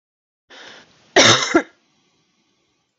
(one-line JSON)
{"cough_length": "3.0 s", "cough_amplitude": 31022, "cough_signal_mean_std_ratio": 0.29, "survey_phase": "beta (2021-08-13 to 2022-03-07)", "age": "45-64", "gender": "Female", "wearing_mask": "No", "symptom_none": true, "smoker_status": "Never smoked", "respiratory_condition_asthma": false, "respiratory_condition_other": false, "recruitment_source": "REACT", "submission_delay": "1 day", "covid_test_result": "Negative", "covid_test_method": "RT-qPCR"}